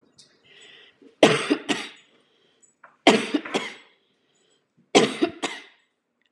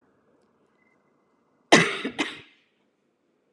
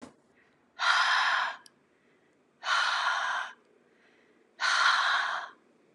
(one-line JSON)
{"three_cough_length": "6.3 s", "three_cough_amplitude": 29587, "three_cough_signal_mean_std_ratio": 0.31, "cough_length": "3.5 s", "cough_amplitude": 32111, "cough_signal_mean_std_ratio": 0.23, "exhalation_length": "5.9 s", "exhalation_amplitude": 9203, "exhalation_signal_mean_std_ratio": 0.57, "survey_phase": "beta (2021-08-13 to 2022-03-07)", "age": "18-44", "gender": "Female", "wearing_mask": "No", "symptom_none": true, "smoker_status": "Never smoked", "respiratory_condition_asthma": false, "respiratory_condition_other": false, "recruitment_source": "REACT", "submission_delay": "1 day", "covid_test_result": "Negative", "covid_test_method": "RT-qPCR"}